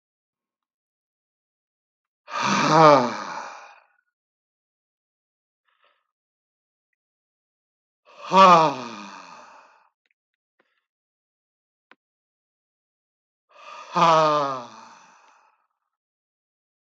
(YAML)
exhalation_length: 17.0 s
exhalation_amplitude: 30044
exhalation_signal_mean_std_ratio: 0.26
survey_phase: beta (2021-08-13 to 2022-03-07)
age: 65+
gender: Male
wearing_mask: 'No'
symptom_none: true
smoker_status: Ex-smoker
respiratory_condition_asthma: false
respiratory_condition_other: false
recruitment_source: REACT
submission_delay: 2 days
covid_test_result: Negative
covid_test_method: RT-qPCR
influenza_a_test_result: Negative
influenza_b_test_result: Negative